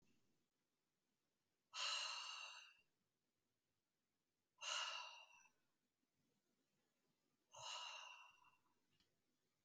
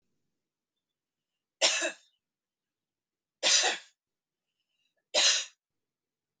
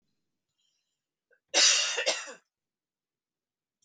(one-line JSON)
{"exhalation_length": "9.6 s", "exhalation_amplitude": 867, "exhalation_signal_mean_std_ratio": 0.38, "three_cough_length": "6.4 s", "three_cough_amplitude": 9989, "three_cough_signal_mean_std_ratio": 0.3, "cough_length": "3.8 s", "cough_amplitude": 12202, "cough_signal_mean_std_ratio": 0.31, "survey_phase": "beta (2021-08-13 to 2022-03-07)", "age": "18-44", "gender": "Female", "wearing_mask": "No", "symptom_none": true, "smoker_status": "Ex-smoker", "respiratory_condition_asthma": false, "respiratory_condition_other": false, "recruitment_source": "REACT", "submission_delay": "6 days", "covid_test_result": "Negative", "covid_test_method": "RT-qPCR", "influenza_a_test_result": "Negative", "influenza_b_test_result": "Negative"}